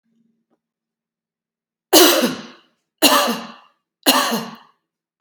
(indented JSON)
{
  "three_cough_length": "5.2 s",
  "three_cough_amplitude": 32768,
  "three_cough_signal_mean_std_ratio": 0.36,
  "survey_phase": "beta (2021-08-13 to 2022-03-07)",
  "age": "45-64",
  "gender": "Female",
  "wearing_mask": "No",
  "symptom_none": true,
  "symptom_onset": "13 days",
  "smoker_status": "Ex-smoker",
  "respiratory_condition_asthma": false,
  "respiratory_condition_other": false,
  "recruitment_source": "REACT",
  "submission_delay": "3 days",
  "covid_test_result": "Negative",
  "covid_test_method": "RT-qPCR",
  "influenza_a_test_result": "Negative",
  "influenza_b_test_result": "Negative"
}